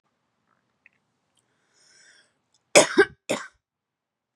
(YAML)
cough_length: 4.4 s
cough_amplitude: 32339
cough_signal_mean_std_ratio: 0.19
survey_phase: beta (2021-08-13 to 2022-03-07)
age: 18-44
gender: Female
wearing_mask: 'No'
symptom_runny_or_blocked_nose: true
symptom_shortness_of_breath: true
symptom_sore_throat: true
symptom_fatigue: true
symptom_headache: true
symptom_onset: 4 days
smoker_status: Never smoked
respiratory_condition_asthma: true
respiratory_condition_other: false
recruitment_source: Test and Trace
submission_delay: 1 day
covid_test_result: Positive
covid_test_method: RT-qPCR
covid_ct_value: 29.2
covid_ct_gene: ORF1ab gene
covid_ct_mean: 29.2
covid_viral_load: 260 copies/ml
covid_viral_load_category: Minimal viral load (< 10K copies/ml)